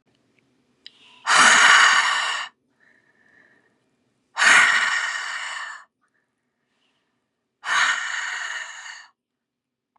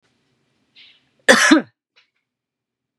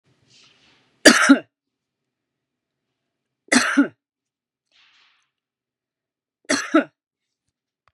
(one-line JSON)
{"exhalation_length": "10.0 s", "exhalation_amplitude": 26761, "exhalation_signal_mean_std_ratio": 0.42, "cough_length": "3.0 s", "cough_amplitude": 32768, "cough_signal_mean_std_ratio": 0.26, "three_cough_length": "7.9 s", "three_cough_amplitude": 32768, "three_cough_signal_mean_std_ratio": 0.23, "survey_phase": "beta (2021-08-13 to 2022-03-07)", "age": "45-64", "gender": "Female", "wearing_mask": "Yes", "symptom_none": true, "smoker_status": "Never smoked", "respiratory_condition_asthma": true, "respiratory_condition_other": true, "recruitment_source": "REACT", "submission_delay": "5 days", "covid_test_result": "Negative", "covid_test_method": "RT-qPCR", "influenza_a_test_result": "Negative", "influenza_b_test_result": "Negative"}